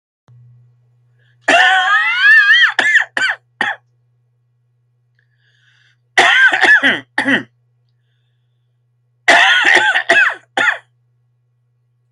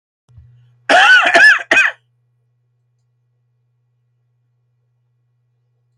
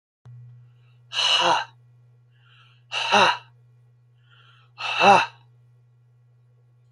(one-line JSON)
{"three_cough_length": "12.1 s", "three_cough_amplitude": 32768, "three_cough_signal_mean_std_ratio": 0.5, "cough_length": "6.0 s", "cough_amplitude": 32047, "cough_signal_mean_std_ratio": 0.33, "exhalation_length": "6.9 s", "exhalation_amplitude": 26885, "exhalation_signal_mean_std_ratio": 0.35, "survey_phase": "alpha (2021-03-01 to 2021-08-12)", "age": "45-64", "gender": "Male", "wearing_mask": "No", "symptom_none": true, "smoker_status": "Never smoked", "respiratory_condition_asthma": false, "respiratory_condition_other": false, "recruitment_source": "REACT", "submission_delay": "4 days", "covid_test_result": "Negative", "covid_test_method": "RT-qPCR"}